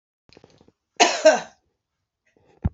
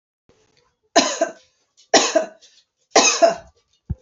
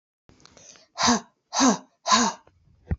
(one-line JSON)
{"cough_length": "2.7 s", "cough_amplitude": 27751, "cough_signal_mean_std_ratio": 0.27, "three_cough_length": "4.0 s", "three_cough_amplitude": 29010, "three_cough_signal_mean_std_ratio": 0.37, "exhalation_length": "3.0 s", "exhalation_amplitude": 17495, "exhalation_signal_mean_std_ratio": 0.41, "survey_phase": "alpha (2021-03-01 to 2021-08-12)", "age": "18-44", "gender": "Female", "wearing_mask": "No", "symptom_fatigue": true, "symptom_onset": "13 days", "smoker_status": "Never smoked", "respiratory_condition_asthma": false, "respiratory_condition_other": false, "recruitment_source": "REACT", "submission_delay": "2 days", "covid_test_result": "Negative", "covid_test_method": "RT-qPCR"}